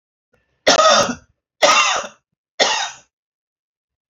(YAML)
three_cough_length: 4.1 s
three_cough_amplitude: 30391
three_cough_signal_mean_std_ratio: 0.42
survey_phase: alpha (2021-03-01 to 2021-08-12)
age: 45-64
gender: Male
wearing_mask: 'No'
symptom_none: true
smoker_status: Ex-smoker
respiratory_condition_asthma: false
respiratory_condition_other: false
recruitment_source: REACT
submission_delay: 10 days
covid_test_result: Negative
covid_test_method: RT-qPCR